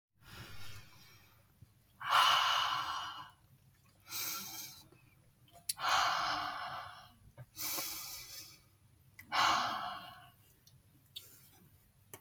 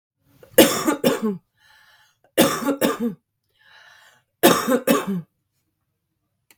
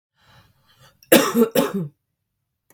exhalation_length: 12.2 s
exhalation_amplitude: 4648
exhalation_signal_mean_std_ratio: 0.48
three_cough_length: 6.6 s
three_cough_amplitude: 32768
three_cough_signal_mean_std_ratio: 0.4
cough_length: 2.7 s
cough_amplitude: 32768
cough_signal_mean_std_ratio: 0.35
survey_phase: beta (2021-08-13 to 2022-03-07)
age: 18-44
gender: Female
wearing_mask: 'No'
symptom_runny_or_blocked_nose: true
smoker_status: Current smoker (1 to 10 cigarettes per day)
respiratory_condition_asthma: false
respiratory_condition_other: false
recruitment_source: Test and Trace
submission_delay: 2 days
covid_test_result: Positive
covid_test_method: RT-qPCR
covid_ct_value: 21.1
covid_ct_gene: ORF1ab gene
covid_ct_mean: 21.3
covid_viral_load: 100000 copies/ml
covid_viral_load_category: Low viral load (10K-1M copies/ml)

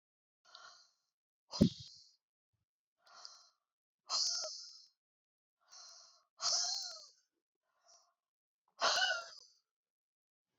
exhalation_length: 10.6 s
exhalation_amplitude: 6292
exhalation_signal_mean_std_ratio: 0.3
survey_phase: beta (2021-08-13 to 2022-03-07)
age: 65+
gender: Female
wearing_mask: 'No'
symptom_none: true
smoker_status: Ex-smoker
respiratory_condition_asthma: false
respiratory_condition_other: false
recruitment_source: REACT
submission_delay: 3 days
covid_test_result: Negative
covid_test_method: RT-qPCR
influenza_a_test_result: Negative
influenza_b_test_result: Negative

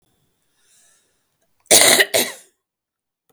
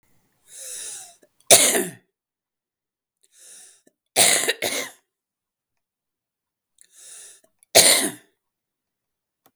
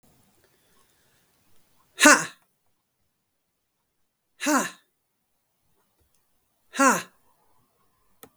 cough_length: 3.3 s
cough_amplitude: 32768
cough_signal_mean_std_ratio: 0.3
three_cough_length: 9.6 s
three_cough_amplitude: 32768
three_cough_signal_mean_std_ratio: 0.28
exhalation_length: 8.4 s
exhalation_amplitude: 32766
exhalation_signal_mean_std_ratio: 0.21
survey_phase: beta (2021-08-13 to 2022-03-07)
age: 45-64
gender: Female
wearing_mask: 'No'
symptom_cough_any: true
symptom_runny_or_blocked_nose: true
symptom_shortness_of_breath: true
symptom_sore_throat: true
symptom_fatigue: true
symptom_fever_high_temperature: true
symptom_headache: true
symptom_change_to_sense_of_smell_or_taste: true
symptom_onset: 5 days
smoker_status: Ex-smoker
respiratory_condition_asthma: true
respiratory_condition_other: false
recruitment_source: Test and Trace
submission_delay: 2 days
covid_test_result: Positive
covid_test_method: RT-qPCR
covid_ct_value: 26.1
covid_ct_gene: ORF1ab gene
covid_ct_mean: 26.8
covid_viral_load: 1600 copies/ml
covid_viral_load_category: Minimal viral load (< 10K copies/ml)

